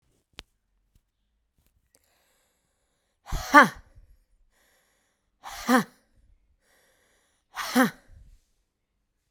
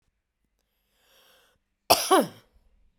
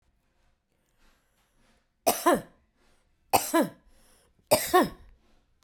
{
  "exhalation_length": "9.3 s",
  "exhalation_amplitude": 30590,
  "exhalation_signal_mean_std_ratio": 0.19,
  "cough_length": "3.0 s",
  "cough_amplitude": 24603,
  "cough_signal_mean_std_ratio": 0.24,
  "three_cough_length": "5.6 s",
  "three_cough_amplitude": 16513,
  "three_cough_signal_mean_std_ratio": 0.3,
  "survey_phase": "beta (2021-08-13 to 2022-03-07)",
  "age": "45-64",
  "gender": "Female",
  "wearing_mask": "No",
  "symptom_runny_or_blocked_nose": true,
  "symptom_onset": "13 days",
  "smoker_status": "Ex-smoker",
  "respiratory_condition_asthma": true,
  "respiratory_condition_other": false,
  "recruitment_source": "REACT",
  "submission_delay": "0 days",
  "covid_test_result": "Negative",
  "covid_test_method": "RT-qPCR"
}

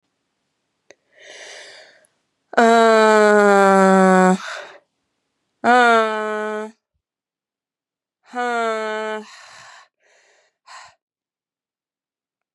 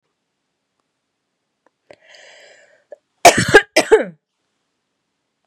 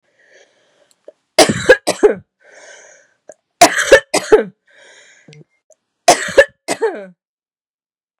{
  "exhalation_length": "12.5 s",
  "exhalation_amplitude": 32756,
  "exhalation_signal_mean_std_ratio": 0.38,
  "cough_length": "5.5 s",
  "cough_amplitude": 32768,
  "cough_signal_mean_std_ratio": 0.22,
  "three_cough_length": "8.2 s",
  "three_cough_amplitude": 32768,
  "three_cough_signal_mean_std_ratio": 0.31,
  "survey_phase": "beta (2021-08-13 to 2022-03-07)",
  "age": "18-44",
  "gender": "Female",
  "wearing_mask": "No",
  "symptom_cough_any": true,
  "symptom_runny_or_blocked_nose": true,
  "symptom_fatigue": true,
  "symptom_headache": true,
  "symptom_change_to_sense_of_smell_or_taste": true,
  "symptom_loss_of_taste": true,
  "symptom_onset": "3 days",
  "smoker_status": "Never smoked",
  "respiratory_condition_asthma": false,
  "respiratory_condition_other": false,
  "recruitment_source": "Test and Trace",
  "submission_delay": "2 days",
  "covid_test_result": "Positive",
  "covid_test_method": "RT-qPCR"
}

